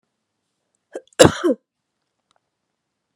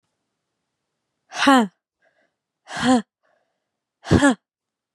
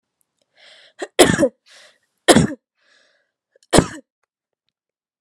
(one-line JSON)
{"cough_length": "3.2 s", "cough_amplitude": 32768, "cough_signal_mean_std_ratio": 0.2, "exhalation_length": "4.9 s", "exhalation_amplitude": 28964, "exhalation_signal_mean_std_ratio": 0.3, "three_cough_length": "5.2 s", "three_cough_amplitude": 32768, "three_cough_signal_mean_std_ratio": 0.26, "survey_phase": "beta (2021-08-13 to 2022-03-07)", "age": "18-44", "gender": "Female", "wearing_mask": "No", "symptom_runny_or_blocked_nose": true, "symptom_change_to_sense_of_smell_or_taste": true, "smoker_status": "Never smoked", "respiratory_condition_asthma": false, "respiratory_condition_other": false, "recruitment_source": "Test and Trace", "submission_delay": "2 days", "covid_test_result": "Positive", "covid_test_method": "ePCR"}